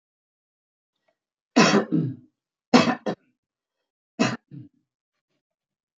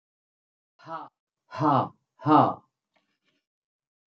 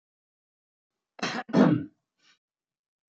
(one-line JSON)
{"three_cough_length": "6.0 s", "three_cough_amplitude": 25668, "three_cough_signal_mean_std_ratio": 0.29, "exhalation_length": "4.1 s", "exhalation_amplitude": 16313, "exhalation_signal_mean_std_ratio": 0.3, "cough_length": "3.2 s", "cough_amplitude": 15291, "cough_signal_mean_std_ratio": 0.28, "survey_phase": "beta (2021-08-13 to 2022-03-07)", "age": "65+", "gender": "Male", "wearing_mask": "No", "symptom_cough_any": true, "symptom_runny_or_blocked_nose": true, "symptom_fever_high_temperature": true, "symptom_onset": "3 days", "smoker_status": "Never smoked", "respiratory_condition_asthma": false, "respiratory_condition_other": false, "recruitment_source": "REACT", "submission_delay": "3 days", "covid_test_result": "Negative", "covid_test_method": "RT-qPCR"}